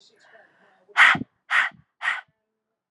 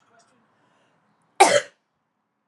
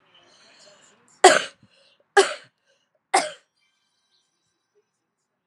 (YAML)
exhalation_length: 2.9 s
exhalation_amplitude: 24355
exhalation_signal_mean_std_ratio: 0.32
cough_length: 2.5 s
cough_amplitude: 31567
cough_signal_mean_std_ratio: 0.22
three_cough_length: 5.5 s
three_cough_amplitude: 32767
three_cough_signal_mean_std_ratio: 0.2
survey_phase: alpha (2021-03-01 to 2021-08-12)
age: 45-64
gender: Female
wearing_mask: 'No'
symptom_cough_any: true
symptom_fatigue: true
symptom_headache: true
smoker_status: Ex-smoker
respiratory_condition_asthma: false
respiratory_condition_other: false
recruitment_source: Test and Trace
submission_delay: 2 days
covid_test_result: Positive
covid_test_method: RT-qPCR
covid_ct_value: 18.8
covid_ct_gene: ORF1ab gene
covid_ct_mean: 19.0
covid_viral_load: 610000 copies/ml
covid_viral_load_category: Low viral load (10K-1M copies/ml)